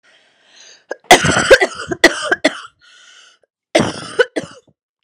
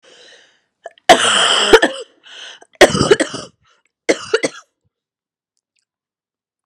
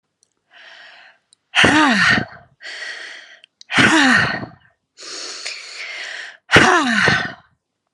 cough_length: 5.0 s
cough_amplitude: 32768
cough_signal_mean_std_ratio: 0.36
three_cough_length: 6.7 s
three_cough_amplitude: 32768
three_cough_signal_mean_std_ratio: 0.34
exhalation_length: 7.9 s
exhalation_amplitude: 32768
exhalation_signal_mean_std_ratio: 0.49
survey_phase: alpha (2021-03-01 to 2021-08-12)
age: 18-44
gender: Female
wearing_mask: 'No'
symptom_diarrhoea: true
symptom_fatigue: true
symptom_fever_high_temperature: true
symptom_change_to_sense_of_smell_or_taste: true
smoker_status: Ex-smoker
respiratory_condition_asthma: false
respiratory_condition_other: false
recruitment_source: Test and Trace
submission_delay: 2 days
covid_test_result: Positive
covid_test_method: RT-qPCR
covid_ct_value: 14.8
covid_ct_gene: ORF1ab gene
covid_ct_mean: 15.2
covid_viral_load: 10000000 copies/ml
covid_viral_load_category: High viral load (>1M copies/ml)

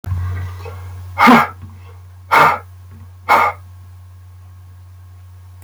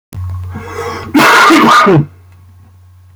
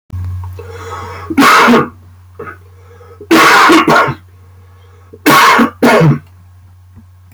exhalation_length: 5.6 s
exhalation_amplitude: 31133
exhalation_signal_mean_std_ratio: 0.45
cough_length: 3.2 s
cough_amplitude: 32768
cough_signal_mean_std_ratio: 0.67
three_cough_length: 7.3 s
three_cough_amplitude: 32768
three_cough_signal_mean_std_ratio: 0.6
survey_phase: beta (2021-08-13 to 2022-03-07)
age: 45-64
gender: Male
wearing_mask: 'No'
symptom_cough_any: true
symptom_runny_or_blocked_nose: true
symptom_onset: 2 days
smoker_status: Never smoked
respiratory_condition_asthma: false
respiratory_condition_other: false
recruitment_source: Test and Trace
submission_delay: 1 day
covid_test_result: Negative
covid_test_method: RT-qPCR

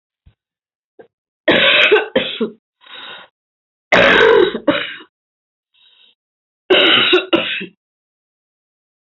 three_cough_length: 9.0 s
three_cough_amplitude: 32768
three_cough_signal_mean_std_ratio: 0.43
survey_phase: beta (2021-08-13 to 2022-03-07)
age: 65+
gender: Female
wearing_mask: 'No'
symptom_cough_any: true
symptom_fatigue: true
symptom_headache: true
symptom_onset: 11 days
smoker_status: Ex-smoker
respiratory_condition_asthma: false
respiratory_condition_other: false
recruitment_source: REACT
submission_delay: 1 day
covid_test_result: Negative
covid_test_method: RT-qPCR
influenza_a_test_result: Negative
influenza_b_test_result: Negative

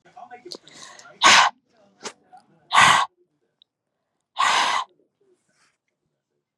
exhalation_length: 6.6 s
exhalation_amplitude: 29774
exhalation_signal_mean_std_ratio: 0.32
survey_phase: beta (2021-08-13 to 2022-03-07)
age: 18-44
gender: Female
wearing_mask: 'No'
symptom_runny_or_blocked_nose: true
symptom_onset: 5 days
smoker_status: Never smoked
respiratory_condition_asthma: false
respiratory_condition_other: false
recruitment_source: REACT
submission_delay: 4 days
covid_test_result: Negative
covid_test_method: RT-qPCR
influenza_a_test_result: Negative
influenza_b_test_result: Negative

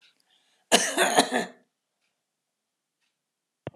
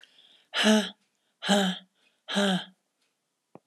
cough_length: 3.8 s
cough_amplitude: 23135
cough_signal_mean_std_ratio: 0.3
exhalation_length: 3.7 s
exhalation_amplitude: 12360
exhalation_signal_mean_std_ratio: 0.42
survey_phase: beta (2021-08-13 to 2022-03-07)
age: 45-64
gender: Female
wearing_mask: 'No'
symptom_none: true
smoker_status: Ex-smoker
respiratory_condition_asthma: false
respiratory_condition_other: false
recruitment_source: REACT
submission_delay: 1 day
covid_test_result: Negative
covid_test_method: RT-qPCR
influenza_a_test_result: Negative
influenza_b_test_result: Negative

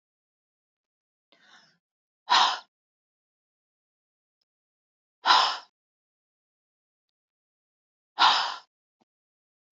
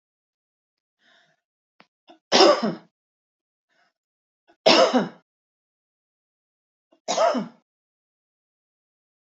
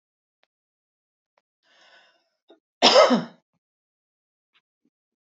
exhalation_length: 9.7 s
exhalation_amplitude: 16835
exhalation_signal_mean_std_ratio: 0.23
three_cough_length: 9.3 s
three_cough_amplitude: 29557
three_cough_signal_mean_std_ratio: 0.26
cough_length: 5.2 s
cough_amplitude: 26139
cough_signal_mean_std_ratio: 0.21
survey_phase: beta (2021-08-13 to 2022-03-07)
age: 65+
gender: Female
wearing_mask: 'No'
symptom_none: true
smoker_status: Never smoked
respiratory_condition_asthma: false
respiratory_condition_other: false
recruitment_source: REACT
submission_delay: 1 day
covid_test_result: Negative
covid_test_method: RT-qPCR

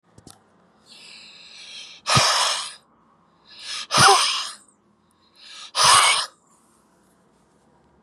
exhalation_length: 8.0 s
exhalation_amplitude: 27887
exhalation_signal_mean_std_ratio: 0.38
survey_phase: beta (2021-08-13 to 2022-03-07)
age: 65+
gender: Male
wearing_mask: 'No'
symptom_none: true
smoker_status: Never smoked
respiratory_condition_asthma: false
respiratory_condition_other: false
recruitment_source: Test and Trace
submission_delay: 2 days
covid_test_result: Positive
covid_test_method: LFT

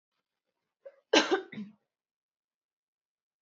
cough_length: 3.4 s
cough_amplitude: 13189
cough_signal_mean_std_ratio: 0.22
survey_phase: beta (2021-08-13 to 2022-03-07)
age: 18-44
gender: Female
wearing_mask: 'No'
symptom_runny_or_blocked_nose: true
symptom_onset: 8 days
smoker_status: Never smoked
respiratory_condition_asthma: false
respiratory_condition_other: false
recruitment_source: REACT
submission_delay: 1 day
covid_test_result: Negative
covid_test_method: RT-qPCR
influenza_a_test_result: Negative
influenza_b_test_result: Negative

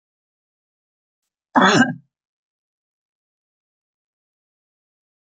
cough_length: 5.2 s
cough_amplitude: 27101
cough_signal_mean_std_ratio: 0.21
survey_phase: beta (2021-08-13 to 2022-03-07)
age: 65+
gender: Female
wearing_mask: 'No'
symptom_none: true
smoker_status: Ex-smoker
respiratory_condition_asthma: false
respiratory_condition_other: false
recruitment_source: REACT
submission_delay: 15 days
covid_test_result: Negative
covid_test_method: RT-qPCR
influenza_a_test_result: Negative
influenza_b_test_result: Negative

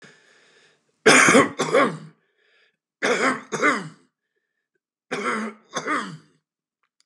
three_cough_length: 7.1 s
three_cough_amplitude: 28784
three_cough_signal_mean_std_ratio: 0.4
survey_phase: beta (2021-08-13 to 2022-03-07)
age: 45-64
gender: Male
wearing_mask: 'No'
symptom_none: true
smoker_status: Current smoker (11 or more cigarettes per day)
respiratory_condition_asthma: false
respiratory_condition_other: false
recruitment_source: REACT
submission_delay: 1 day
covid_test_result: Negative
covid_test_method: RT-qPCR
influenza_a_test_result: Negative
influenza_b_test_result: Negative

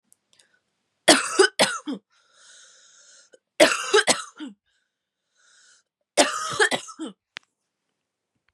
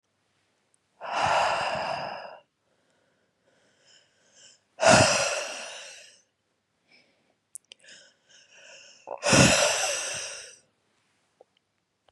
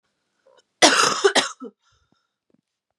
three_cough_length: 8.5 s
three_cough_amplitude: 32481
three_cough_signal_mean_std_ratio: 0.31
exhalation_length: 12.1 s
exhalation_amplitude: 20922
exhalation_signal_mean_std_ratio: 0.37
cough_length: 3.0 s
cough_amplitude: 32161
cough_signal_mean_std_ratio: 0.33
survey_phase: beta (2021-08-13 to 2022-03-07)
age: 18-44
gender: Female
wearing_mask: 'No'
symptom_cough_any: true
symptom_sore_throat: true
symptom_fatigue: true
symptom_fever_high_temperature: true
symptom_headache: true
symptom_change_to_sense_of_smell_or_taste: true
symptom_loss_of_taste: true
symptom_other: true
symptom_onset: 5 days
smoker_status: Never smoked
respiratory_condition_asthma: false
respiratory_condition_other: false
recruitment_source: Test and Trace
submission_delay: 2 days
covid_test_result: Positive
covid_test_method: RT-qPCR
covid_ct_value: 31.7
covid_ct_gene: N gene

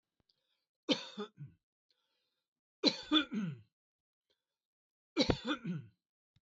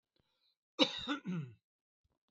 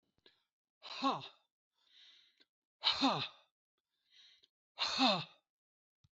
three_cough_length: 6.5 s
three_cough_amplitude: 7138
three_cough_signal_mean_std_ratio: 0.31
cough_length: 2.3 s
cough_amplitude: 7283
cough_signal_mean_std_ratio: 0.33
exhalation_length: 6.1 s
exhalation_amplitude: 4571
exhalation_signal_mean_std_ratio: 0.34
survey_phase: beta (2021-08-13 to 2022-03-07)
age: 65+
gender: Male
wearing_mask: 'No'
symptom_none: true
smoker_status: Ex-smoker
respiratory_condition_asthma: false
respiratory_condition_other: false
recruitment_source: REACT
submission_delay: 2 days
covid_test_result: Negative
covid_test_method: RT-qPCR
influenza_a_test_result: Unknown/Void
influenza_b_test_result: Unknown/Void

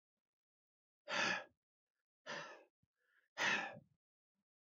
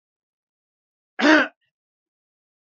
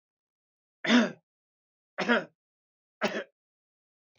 exhalation_length: 4.7 s
exhalation_amplitude: 1792
exhalation_signal_mean_std_ratio: 0.34
cough_length: 2.6 s
cough_amplitude: 27039
cough_signal_mean_std_ratio: 0.23
three_cough_length: 4.2 s
three_cough_amplitude: 11402
three_cough_signal_mean_std_ratio: 0.29
survey_phase: beta (2021-08-13 to 2022-03-07)
age: 65+
gender: Male
wearing_mask: 'No'
symptom_none: true
smoker_status: Never smoked
respiratory_condition_asthma: false
respiratory_condition_other: false
recruitment_source: REACT
submission_delay: 3 days
covid_test_result: Negative
covid_test_method: RT-qPCR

